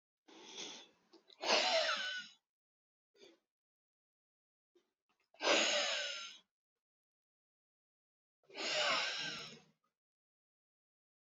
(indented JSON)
{
  "exhalation_length": "11.3 s",
  "exhalation_amplitude": 4707,
  "exhalation_signal_mean_std_ratio": 0.38,
  "survey_phase": "beta (2021-08-13 to 2022-03-07)",
  "age": "18-44",
  "gender": "Female",
  "wearing_mask": "No",
  "symptom_cough_any": true,
  "symptom_runny_or_blocked_nose": true,
  "symptom_sore_throat": true,
  "symptom_fatigue": true,
  "symptom_headache": true,
  "symptom_onset": "2 days",
  "smoker_status": "Never smoked",
  "respiratory_condition_asthma": false,
  "respiratory_condition_other": false,
  "recruitment_source": "Test and Trace",
  "submission_delay": "2 days",
  "covid_test_result": "Positive",
  "covid_test_method": "RT-qPCR",
  "covid_ct_value": 22.3,
  "covid_ct_gene": "ORF1ab gene"
}